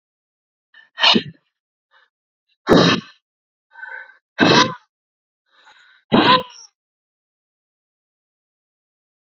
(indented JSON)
{
  "exhalation_length": "9.2 s",
  "exhalation_amplitude": 29587,
  "exhalation_signal_mean_std_ratio": 0.29,
  "survey_phase": "beta (2021-08-13 to 2022-03-07)",
  "age": "18-44",
  "gender": "Female",
  "wearing_mask": "No",
  "symptom_cough_any": true,
  "symptom_runny_or_blocked_nose": true,
  "symptom_shortness_of_breath": true,
  "symptom_sore_throat": true,
  "symptom_diarrhoea": true,
  "symptom_fever_high_temperature": true,
  "symptom_headache": true,
  "symptom_change_to_sense_of_smell_or_taste": true,
  "symptom_onset": "3 days",
  "smoker_status": "Current smoker (e-cigarettes or vapes only)",
  "respiratory_condition_asthma": false,
  "respiratory_condition_other": false,
  "recruitment_source": "Test and Trace",
  "submission_delay": "2 days",
  "covid_test_result": "Positive",
  "covid_test_method": "RT-qPCR",
  "covid_ct_value": 15.5,
  "covid_ct_gene": "ORF1ab gene",
  "covid_ct_mean": 15.9,
  "covid_viral_load": "6100000 copies/ml",
  "covid_viral_load_category": "High viral load (>1M copies/ml)"
}